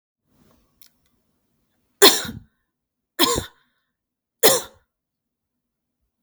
three_cough_length: 6.2 s
three_cough_amplitude: 32768
three_cough_signal_mean_std_ratio: 0.22
survey_phase: beta (2021-08-13 to 2022-03-07)
age: 18-44
gender: Female
wearing_mask: 'No'
symptom_cough_any: true
smoker_status: Never smoked
respiratory_condition_asthma: false
respiratory_condition_other: false
recruitment_source: REACT
submission_delay: 2 days
covid_test_result: Negative
covid_test_method: RT-qPCR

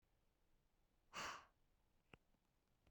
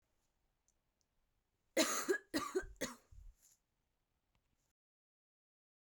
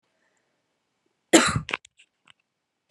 exhalation_length: 2.9 s
exhalation_amplitude: 365
exhalation_signal_mean_std_ratio: 0.33
three_cough_length: 5.9 s
three_cough_amplitude: 3702
three_cough_signal_mean_std_ratio: 0.28
cough_length: 2.9 s
cough_amplitude: 28689
cough_signal_mean_std_ratio: 0.22
survey_phase: beta (2021-08-13 to 2022-03-07)
age: 18-44
gender: Female
wearing_mask: 'No'
symptom_none: true
smoker_status: Never smoked
respiratory_condition_asthma: false
respiratory_condition_other: false
recruitment_source: REACT
submission_delay: 1 day
covid_test_result: Negative
covid_test_method: RT-qPCR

